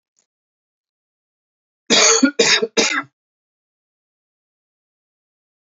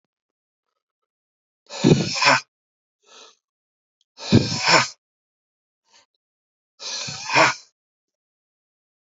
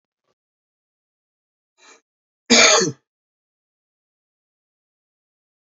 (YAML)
three_cough_length: 5.6 s
three_cough_amplitude: 29648
three_cough_signal_mean_std_ratio: 0.31
exhalation_length: 9.0 s
exhalation_amplitude: 27387
exhalation_signal_mean_std_ratio: 0.3
cough_length: 5.6 s
cough_amplitude: 32313
cough_signal_mean_std_ratio: 0.21
survey_phase: beta (2021-08-13 to 2022-03-07)
age: 45-64
gender: Male
wearing_mask: 'No'
symptom_new_continuous_cough: true
symptom_sore_throat: true
symptom_onset: 6 days
smoker_status: Never smoked
respiratory_condition_asthma: false
respiratory_condition_other: false
recruitment_source: Test and Trace
submission_delay: 1 day
covid_test_result: Positive
covid_test_method: RT-qPCR
covid_ct_value: 18.1
covid_ct_gene: ORF1ab gene
covid_ct_mean: 19.4
covid_viral_load: 440000 copies/ml
covid_viral_load_category: Low viral load (10K-1M copies/ml)